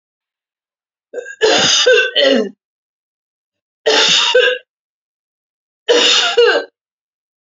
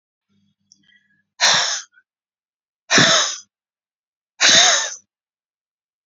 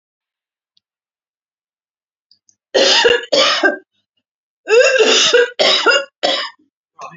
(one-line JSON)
{"three_cough_length": "7.4 s", "three_cough_amplitude": 32565, "three_cough_signal_mean_std_ratio": 0.5, "exhalation_length": "6.1 s", "exhalation_amplitude": 32767, "exhalation_signal_mean_std_ratio": 0.37, "cough_length": "7.2 s", "cough_amplitude": 32767, "cough_signal_mean_std_ratio": 0.49, "survey_phase": "beta (2021-08-13 to 2022-03-07)", "age": "45-64", "gender": "Female", "wearing_mask": "No", "symptom_none": true, "smoker_status": "Ex-smoker", "respiratory_condition_asthma": false, "respiratory_condition_other": false, "recruitment_source": "REACT", "submission_delay": "3 days", "covid_test_result": "Negative", "covid_test_method": "RT-qPCR", "influenza_a_test_result": "Negative", "influenza_b_test_result": "Negative"}